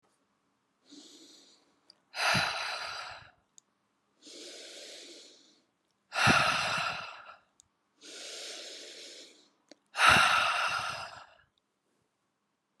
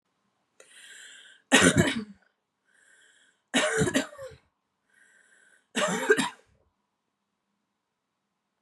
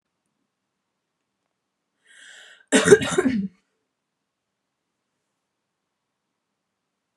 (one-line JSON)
{"exhalation_length": "12.8 s", "exhalation_amplitude": 12189, "exhalation_signal_mean_std_ratio": 0.39, "three_cough_length": "8.6 s", "three_cough_amplitude": 20781, "three_cough_signal_mean_std_ratio": 0.32, "cough_length": "7.2 s", "cough_amplitude": 31720, "cough_signal_mean_std_ratio": 0.21, "survey_phase": "beta (2021-08-13 to 2022-03-07)", "age": "18-44", "gender": "Female", "wearing_mask": "No", "symptom_none": true, "smoker_status": "Never smoked", "respiratory_condition_asthma": false, "respiratory_condition_other": false, "recruitment_source": "REACT", "submission_delay": "0 days", "covid_test_result": "Negative", "covid_test_method": "RT-qPCR"}